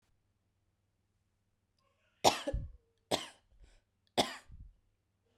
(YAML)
cough_length: 5.4 s
cough_amplitude: 9865
cough_signal_mean_std_ratio: 0.23
survey_phase: beta (2021-08-13 to 2022-03-07)
age: 18-44
gender: Female
wearing_mask: 'No'
symptom_runny_or_blocked_nose: true
symptom_sore_throat: true
smoker_status: Never smoked
respiratory_condition_asthma: false
respiratory_condition_other: false
recruitment_source: Test and Trace
submission_delay: 1 day
covid_test_result: Positive
covid_test_method: RT-qPCR
covid_ct_value: 32.6
covid_ct_gene: ORF1ab gene
covid_ct_mean: 34.4
covid_viral_load: 5.3 copies/ml
covid_viral_load_category: Minimal viral load (< 10K copies/ml)